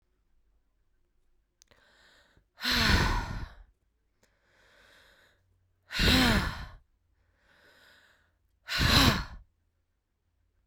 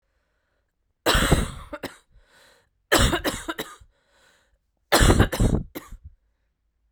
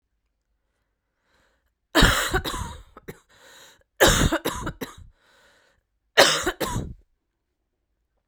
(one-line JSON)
{"exhalation_length": "10.7 s", "exhalation_amplitude": 12281, "exhalation_signal_mean_std_ratio": 0.35, "three_cough_length": "6.9 s", "three_cough_amplitude": 24206, "three_cough_signal_mean_std_ratio": 0.38, "cough_length": "8.3 s", "cough_amplitude": 32768, "cough_signal_mean_std_ratio": 0.34, "survey_phase": "beta (2021-08-13 to 2022-03-07)", "age": "18-44", "gender": "Female", "wearing_mask": "No", "symptom_cough_any": true, "symptom_runny_or_blocked_nose": true, "smoker_status": "Never smoked", "respiratory_condition_asthma": false, "respiratory_condition_other": false, "recruitment_source": "REACT", "submission_delay": "1 day", "covid_test_result": "Negative", "covid_test_method": "RT-qPCR", "influenza_a_test_result": "Negative", "influenza_b_test_result": "Negative"}